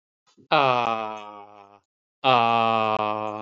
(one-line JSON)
{"exhalation_length": "3.4 s", "exhalation_amplitude": 21994, "exhalation_signal_mean_std_ratio": 0.5, "survey_phase": "beta (2021-08-13 to 2022-03-07)", "age": "45-64", "gender": "Male", "wearing_mask": "No", "symptom_none": true, "smoker_status": "Ex-smoker", "respiratory_condition_asthma": false, "respiratory_condition_other": false, "recruitment_source": "REACT", "submission_delay": "1 day", "covid_test_result": "Negative", "covid_test_method": "RT-qPCR", "influenza_a_test_result": "Negative", "influenza_b_test_result": "Negative"}